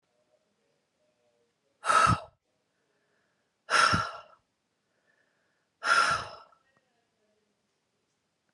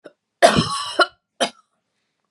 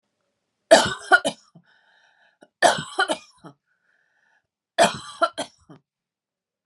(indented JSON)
{
  "exhalation_length": "8.5 s",
  "exhalation_amplitude": 9886,
  "exhalation_signal_mean_std_ratio": 0.29,
  "cough_length": "2.3 s",
  "cough_amplitude": 32767,
  "cough_signal_mean_std_ratio": 0.35,
  "three_cough_length": "6.7 s",
  "three_cough_amplitude": 31021,
  "three_cough_signal_mean_std_ratio": 0.27,
  "survey_phase": "beta (2021-08-13 to 2022-03-07)",
  "age": "45-64",
  "gender": "Female",
  "wearing_mask": "No",
  "symptom_none": true,
  "smoker_status": "Never smoked",
  "respiratory_condition_asthma": false,
  "respiratory_condition_other": false,
  "recruitment_source": "REACT",
  "submission_delay": "1 day",
  "covid_test_result": "Negative",
  "covid_test_method": "RT-qPCR",
  "influenza_a_test_result": "Negative",
  "influenza_b_test_result": "Negative"
}